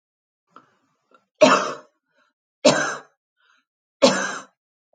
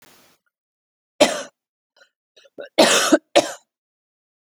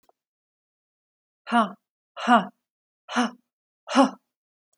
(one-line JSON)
{"three_cough_length": "4.9 s", "three_cough_amplitude": 29791, "three_cough_signal_mean_std_ratio": 0.3, "cough_length": "4.4 s", "cough_amplitude": 32767, "cough_signal_mean_std_ratio": 0.29, "exhalation_length": "4.8 s", "exhalation_amplitude": 20838, "exhalation_signal_mean_std_ratio": 0.29, "survey_phase": "beta (2021-08-13 to 2022-03-07)", "age": "45-64", "gender": "Female", "wearing_mask": "No", "symptom_fatigue": true, "symptom_onset": "10 days", "smoker_status": "Ex-smoker", "respiratory_condition_asthma": false, "respiratory_condition_other": false, "recruitment_source": "REACT", "submission_delay": "1 day", "covid_test_result": "Negative", "covid_test_method": "RT-qPCR", "influenza_a_test_result": "Negative", "influenza_b_test_result": "Negative"}